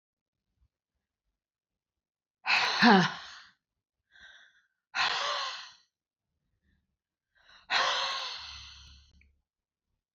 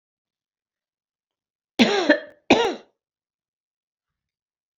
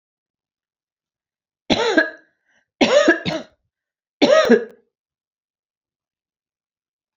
{"exhalation_length": "10.2 s", "exhalation_amplitude": 13620, "exhalation_signal_mean_std_ratio": 0.32, "cough_length": "4.8 s", "cough_amplitude": 26862, "cough_signal_mean_std_ratio": 0.26, "three_cough_length": "7.2 s", "three_cough_amplitude": 28407, "three_cough_signal_mean_std_ratio": 0.32, "survey_phase": "alpha (2021-03-01 to 2021-08-12)", "age": "65+", "gender": "Female", "wearing_mask": "No", "symptom_none": true, "smoker_status": "Ex-smoker", "respiratory_condition_asthma": false, "respiratory_condition_other": false, "recruitment_source": "REACT", "submission_delay": "1 day", "covid_test_result": "Negative", "covid_test_method": "RT-qPCR"}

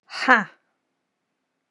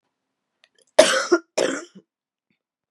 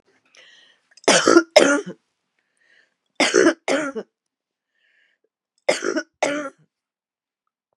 {"exhalation_length": "1.7 s", "exhalation_amplitude": 31903, "exhalation_signal_mean_std_ratio": 0.25, "cough_length": "2.9 s", "cough_amplitude": 32768, "cough_signal_mean_std_ratio": 0.3, "three_cough_length": "7.8 s", "three_cough_amplitude": 32768, "three_cough_signal_mean_std_ratio": 0.33, "survey_phase": "beta (2021-08-13 to 2022-03-07)", "age": "45-64", "gender": "Female", "wearing_mask": "No", "symptom_cough_any": true, "symptom_runny_or_blocked_nose": true, "symptom_headache": true, "symptom_onset": "2 days", "smoker_status": "Ex-smoker", "respiratory_condition_asthma": false, "respiratory_condition_other": false, "recruitment_source": "Test and Trace", "submission_delay": "1 day", "covid_test_result": "Positive", "covid_test_method": "RT-qPCR", "covid_ct_value": 21.9, "covid_ct_gene": "ORF1ab gene", "covid_ct_mean": 22.3, "covid_viral_load": "47000 copies/ml", "covid_viral_load_category": "Low viral load (10K-1M copies/ml)"}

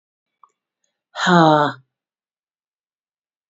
{"exhalation_length": "3.5 s", "exhalation_amplitude": 27335, "exhalation_signal_mean_std_ratio": 0.29, "survey_phase": "beta (2021-08-13 to 2022-03-07)", "age": "45-64", "gender": "Female", "wearing_mask": "No", "symptom_cough_any": true, "symptom_runny_or_blocked_nose": true, "symptom_sore_throat": true, "symptom_fatigue": true, "symptom_headache": true, "symptom_onset": "2 days", "smoker_status": "Ex-smoker", "respiratory_condition_asthma": false, "respiratory_condition_other": false, "recruitment_source": "Test and Trace", "submission_delay": "1 day", "covid_test_result": "Positive", "covid_test_method": "RT-qPCR", "covid_ct_value": 30.0, "covid_ct_gene": "ORF1ab gene"}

